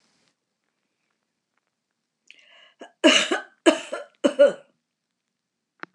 {"cough_length": "5.9 s", "cough_amplitude": 24167, "cough_signal_mean_std_ratio": 0.26, "survey_phase": "alpha (2021-03-01 to 2021-08-12)", "age": "65+", "gender": "Female", "wearing_mask": "No", "symptom_none": true, "smoker_status": "Never smoked", "respiratory_condition_asthma": false, "respiratory_condition_other": false, "recruitment_source": "REACT", "submission_delay": "1 day", "covid_test_result": "Negative", "covid_test_method": "RT-qPCR"}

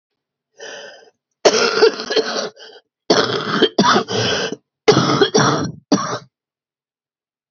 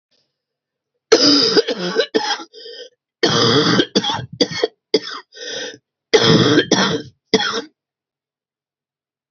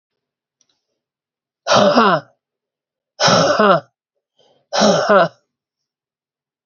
{"cough_length": "7.5 s", "cough_amplitude": 32768, "cough_signal_mean_std_ratio": 0.52, "three_cough_length": "9.3 s", "three_cough_amplitude": 31318, "three_cough_signal_mean_std_ratio": 0.5, "exhalation_length": "6.7 s", "exhalation_amplitude": 32768, "exhalation_signal_mean_std_ratio": 0.42, "survey_phase": "beta (2021-08-13 to 2022-03-07)", "age": "45-64", "gender": "Female", "wearing_mask": "No", "symptom_cough_any": true, "symptom_new_continuous_cough": true, "symptom_runny_or_blocked_nose": true, "symptom_fatigue": true, "symptom_fever_high_temperature": true, "symptom_headache": true, "symptom_change_to_sense_of_smell_or_taste": true, "symptom_loss_of_taste": true, "smoker_status": "Ex-smoker", "respiratory_condition_asthma": false, "respiratory_condition_other": false, "recruitment_source": "Test and Trace", "submission_delay": "4 days", "covid_test_result": "Positive", "covid_test_method": "ePCR"}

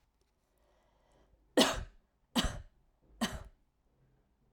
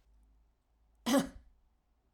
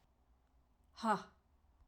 {"three_cough_length": "4.5 s", "three_cough_amplitude": 7224, "three_cough_signal_mean_std_ratio": 0.27, "cough_length": "2.1 s", "cough_amplitude": 4615, "cough_signal_mean_std_ratio": 0.27, "exhalation_length": "1.9 s", "exhalation_amplitude": 2465, "exhalation_signal_mean_std_ratio": 0.28, "survey_phase": "alpha (2021-03-01 to 2021-08-12)", "age": "45-64", "gender": "Female", "wearing_mask": "No", "symptom_cough_any": true, "symptom_shortness_of_breath": true, "symptom_onset": "3 days", "smoker_status": "Never smoked", "respiratory_condition_asthma": false, "respiratory_condition_other": false, "recruitment_source": "Test and Trace", "submission_delay": "1 day", "covid_test_result": "Positive", "covid_test_method": "RT-qPCR"}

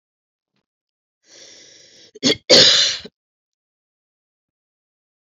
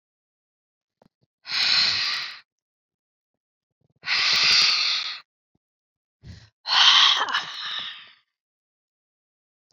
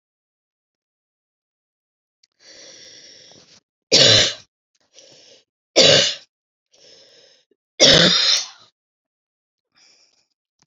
{"cough_length": "5.4 s", "cough_amplitude": 32094, "cough_signal_mean_std_ratio": 0.26, "exhalation_length": "9.7 s", "exhalation_amplitude": 26237, "exhalation_signal_mean_std_ratio": 0.43, "three_cough_length": "10.7 s", "three_cough_amplitude": 32768, "three_cough_signal_mean_std_ratio": 0.29, "survey_phase": "beta (2021-08-13 to 2022-03-07)", "age": "18-44", "gender": "Female", "wearing_mask": "No", "symptom_none": true, "symptom_onset": "7 days", "smoker_status": "Never smoked", "respiratory_condition_asthma": false, "respiratory_condition_other": false, "recruitment_source": "REACT", "submission_delay": "13 days", "covid_test_result": "Negative", "covid_test_method": "RT-qPCR", "influenza_a_test_result": "Negative", "influenza_b_test_result": "Negative"}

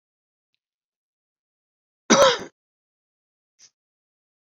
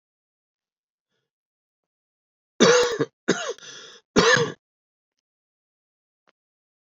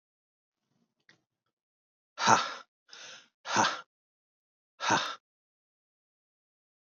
{"cough_length": "4.5 s", "cough_amplitude": 30393, "cough_signal_mean_std_ratio": 0.19, "three_cough_length": "6.8 s", "three_cough_amplitude": 28489, "three_cough_signal_mean_std_ratio": 0.29, "exhalation_length": "7.0 s", "exhalation_amplitude": 17637, "exhalation_signal_mean_std_ratio": 0.26, "survey_phase": "beta (2021-08-13 to 2022-03-07)", "age": "45-64", "gender": "Male", "wearing_mask": "No", "symptom_cough_any": true, "symptom_runny_or_blocked_nose": true, "symptom_sore_throat": true, "smoker_status": "Never smoked", "respiratory_condition_asthma": false, "respiratory_condition_other": false, "recruitment_source": "Test and Trace", "submission_delay": "2 days", "covid_test_result": "Positive", "covid_test_method": "RT-qPCR", "covid_ct_value": 19.6, "covid_ct_gene": "ORF1ab gene", "covid_ct_mean": 20.2, "covid_viral_load": "240000 copies/ml", "covid_viral_load_category": "Low viral load (10K-1M copies/ml)"}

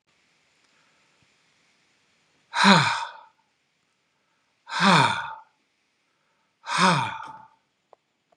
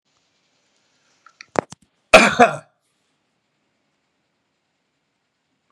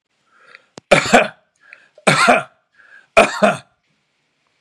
{"exhalation_length": "8.4 s", "exhalation_amplitude": 30561, "exhalation_signal_mean_std_ratio": 0.32, "cough_length": "5.7 s", "cough_amplitude": 32768, "cough_signal_mean_std_ratio": 0.18, "three_cough_length": "4.6 s", "three_cough_amplitude": 32768, "three_cough_signal_mean_std_ratio": 0.35, "survey_phase": "beta (2021-08-13 to 2022-03-07)", "age": "65+", "gender": "Male", "wearing_mask": "No", "symptom_none": true, "smoker_status": "Never smoked", "respiratory_condition_asthma": false, "respiratory_condition_other": false, "recruitment_source": "REACT", "submission_delay": "2 days", "covid_test_result": "Negative", "covid_test_method": "RT-qPCR"}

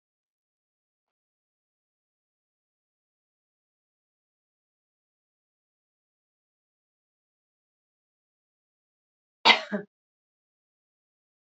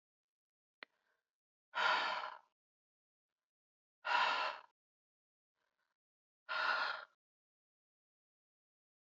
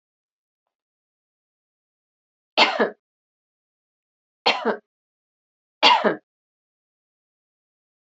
{"cough_length": "11.4 s", "cough_amplitude": 24596, "cough_signal_mean_std_ratio": 0.09, "exhalation_length": "9.0 s", "exhalation_amplitude": 2809, "exhalation_signal_mean_std_ratio": 0.33, "three_cough_length": "8.1 s", "three_cough_amplitude": 28243, "three_cough_signal_mean_std_ratio": 0.23, "survey_phase": "beta (2021-08-13 to 2022-03-07)", "age": "65+", "gender": "Female", "wearing_mask": "No", "symptom_none": true, "smoker_status": "Ex-smoker", "respiratory_condition_asthma": false, "respiratory_condition_other": false, "recruitment_source": "REACT", "submission_delay": "2 days", "covid_test_result": "Negative", "covid_test_method": "RT-qPCR"}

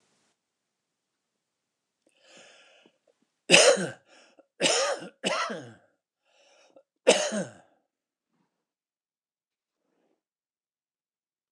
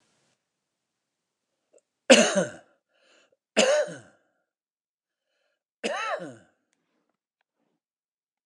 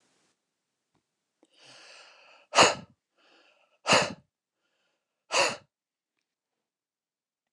{"cough_length": "11.5 s", "cough_amplitude": 27739, "cough_signal_mean_std_ratio": 0.25, "three_cough_length": "8.5 s", "three_cough_amplitude": 28019, "three_cough_signal_mean_std_ratio": 0.24, "exhalation_length": "7.5 s", "exhalation_amplitude": 18734, "exhalation_signal_mean_std_ratio": 0.22, "survey_phase": "alpha (2021-03-01 to 2021-08-12)", "age": "65+", "gender": "Male", "wearing_mask": "No", "symptom_none": true, "smoker_status": "Ex-smoker", "respiratory_condition_asthma": false, "respiratory_condition_other": false, "recruitment_source": "REACT", "submission_delay": "31 days", "covid_test_result": "Negative", "covid_test_method": "RT-qPCR"}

